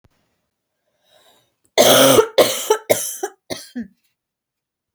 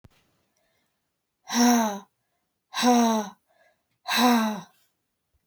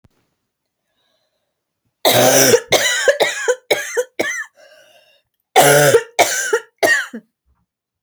{"cough_length": "4.9 s", "cough_amplitude": 32768, "cough_signal_mean_std_ratio": 0.36, "exhalation_length": "5.5 s", "exhalation_amplitude": 13407, "exhalation_signal_mean_std_ratio": 0.44, "three_cough_length": "8.0 s", "three_cough_amplitude": 32768, "three_cough_signal_mean_std_ratio": 0.48, "survey_phase": "beta (2021-08-13 to 2022-03-07)", "age": "18-44", "gender": "Female", "wearing_mask": "No", "symptom_cough_any": true, "symptom_runny_or_blocked_nose": true, "symptom_shortness_of_breath": true, "symptom_sore_throat": true, "symptom_fatigue": true, "symptom_headache": true, "symptom_onset": "4 days", "smoker_status": "Never smoked", "respiratory_condition_asthma": false, "respiratory_condition_other": false, "recruitment_source": "Test and Trace", "submission_delay": "2 days", "covid_test_result": "Positive", "covid_test_method": "ePCR"}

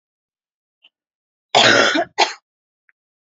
{"cough_length": "3.3 s", "cough_amplitude": 32100, "cough_signal_mean_std_ratio": 0.34, "survey_phase": "alpha (2021-03-01 to 2021-08-12)", "age": "18-44", "gender": "Female", "wearing_mask": "No", "symptom_none": true, "smoker_status": "Never smoked", "respiratory_condition_asthma": false, "respiratory_condition_other": false, "recruitment_source": "REACT", "submission_delay": "1 day", "covid_test_result": "Negative", "covid_test_method": "RT-qPCR"}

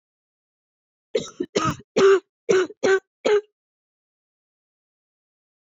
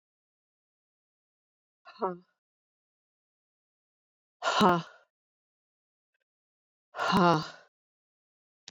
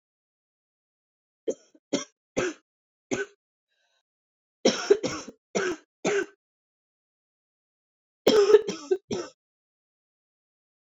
{"cough_length": "5.6 s", "cough_amplitude": 18115, "cough_signal_mean_std_ratio": 0.35, "exhalation_length": "8.7 s", "exhalation_amplitude": 10909, "exhalation_signal_mean_std_ratio": 0.24, "three_cough_length": "10.8 s", "three_cough_amplitude": 21119, "three_cough_signal_mean_std_ratio": 0.29, "survey_phase": "beta (2021-08-13 to 2022-03-07)", "age": "45-64", "gender": "Female", "wearing_mask": "No", "symptom_cough_any": true, "symptom_runny_or_blocked_nose": true, "symptom_headache": true, "symptom_change_to_sense_of_smell_or_taste": true, "symptom_loss_of_taste": true, "symptom_other": true, "smoker_status": "Never smoked", "respiratory_condition_asthma": false, "respiratory_condition_other": false, "recruitment_source": "Test and Trace", "submission_delay": "2 days", "covid_test_result": "Positive", "covid_test_method": "ePCR"}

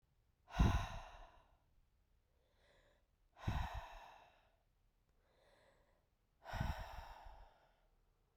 {"exhalation_length": "8.4 s", "exhalation_amplitude": 2832, "exhalation_signal_mean_std_ratio": 0.31, "survey_phase": "beta (2021-08-13 to 2022-03-07)", "age": "45-64", "gender": "Female", "wearing_mask": "No", "symptom_cough_any": true, "symptom_new_continuous_cough": true, "symptom_runny_or_blocked_nose": true, "symptom_shortness_of_breath": true, "symptom_sore_throat": true, "symptom_fatigue": true, "symptom_fever_high_temperature": true, "symptom_headache": true, "symptom_change_to_sense_of_smell_or_taste": true, "symptom_other": true, "symptom_onset": "3 days", "smoker_status": "Never smoked", "respiratory_condition_asthma": false, "respiratory_condition_other": false, "recruitment_source": "Test and Trace", "submission_delay": "2 days", "covid_test_result": "Positive", "covid_test_method": "RT-qPCR", "covid_ct_value": 26.8, "covid_ct_gene": "N gene"}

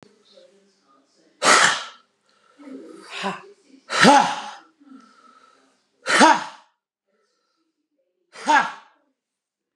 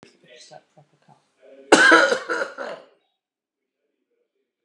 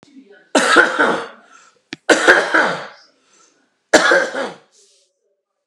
{"exhalation_length": "9.8 s", "exhalation_amplitude": 32768, "exhalation_signal_mean_std_ratio": 0.32, "cough_length": "4.6 s", "cough_amplitude": 32767, "cough_signal_mean_std_ratio": 0.29, "three_cough_length": "5.7 s", "three_cough_amplitude": 32768, "three_cough_signal_mean_std_ratio": 0.44, "survey_phase": "beta (2021-08-13 to 2022-03-07)", "age": "45-64", "gender": "Male", "wearing_mask": "No", "symptom_none": true, "smoker_status": "Ex-smoker", "respiratory_condition_asthma": false, "respiratory_condition_other": false, "recruitment_source": "REACT", "submission_delay": "1 day", "covid_test_result": "Negative", "covid_test_method": "RT-qPCR"}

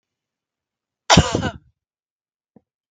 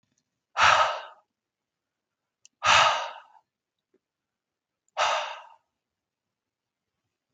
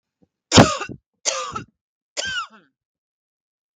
{"cough_length": "2.9 s", "cough_amplitude": 32767, "cough_signal_mean_std_ratio": 0.23, "exhalation_length": "7.3 s", "exhalation_amplitude": 17878, "exhalation_signal_mean_std_ratio": 0.3, "three_cough_length": "3.8 s", "three_cough_amplitude": 32768, "three_cough_signal_mean_std_ratio": 0.27, "survey_phase": "beta (2021-08-13 to 2022-03-07)", "age": "45-64", "gender": "Female", "wearing_mask": "No", "symptom_abdominal_pain": true, "symptom_onset": "12 days", "smoker_status": "Never smoked", "respiratory_condition_asthma": false, "respiratory_condition_other": false, "recruitment_source": "REACT", "submission_delay": "2 days", "covid_test_result": "Negative", "covid_test_method": "RT-qPCR", "influenza_a_test_result": "Negative", "influenza_b_test_result": "Negative"}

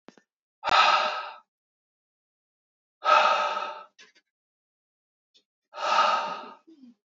{"exhalation_length": "7.1 s", "exhalation_amplitude": 18569, "exhalation_signal_mean_std_ratio": 0.4, "survey_phase": "beta (2021-08-13 to 2022-03-07)", "age": "18-44", "gender": "Male", "wearing_mask": "No", "symptom_cough_any": true, "symptom_runny_or_blocked_nose": true, "symptom_fatigue": true, "symptom_other": true, "smoker_status": "Never smoked", "respiratory_condition_asthma": false, "respiratory_condition_other": false, "recruitment_source": "Test and Trace", "submission_delay": "2 days", "covid_test_result": "Positive", "covid_test_method": "ePCR"}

